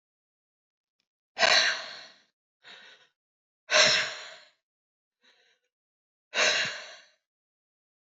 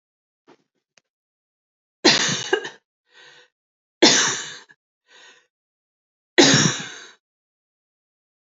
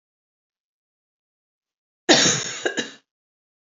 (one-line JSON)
{"exhalation_length": "8.0 s", "exhalation_amplitude": 14545, "exhalation_signal_mean_std_ratio": 0.32, "three_cough_length": "8.5 s", "three_cough_amplitude": 30454, "three_cough_signal_mean_std_ratio": 0.29, "cough_length": "3.8 s", "cough_amplitude": 28543, "cough_signal_mean_std_ratio": 0.28, "survey_phase": "beta (2021-08-13 to 2022-03-07)", "age": "45-64", "gender": "Female", "wearing_mask": "No", "symptom_none": true, "smoker_status": "Ex-smoker", "respiratory_condition_asthma": true, "respiratory_condition_other": true, "recruitment_source": "REACT", "submission_delay": "7 days", "covid_test_result": "Negative", "covid_test_method": "RT-qPCR", "influenza_a_test_result": "Unknown/Void", "influenza_b_test_result": "Unknown/Void"}